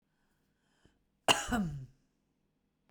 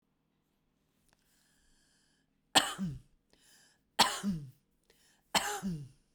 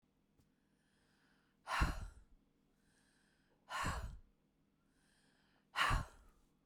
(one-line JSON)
{"cough_length": "2.9 s", "cough_amplitude": 8736, "cough_signal_mean_std_ratio": 0.29, "three_cough_length": "6.1 s", "three_cough_amplitude": 10068, "three_cough_signal_mean_std_ratio": 0.3, "exhalation_length": "6.7 s", "exhalation_amplitude": 2736, "exhalation_signal_mean_std_ratio": 0.33, "survey_phase": "beta (2021-08-13 to 2022-03-07)", "age": "45-64", "gender": "Female", "wearing_mask": "No", "symptom_none": true, "smoker_status": "Ex-smoker", "respiratory_condition_asthma": false, "respiratory_condition_other": false, "recruitment_source": "REACT", "submission_delay": "2 days", "covid_test_result": "Negative", "covid_test_method": "RT-qPCR"}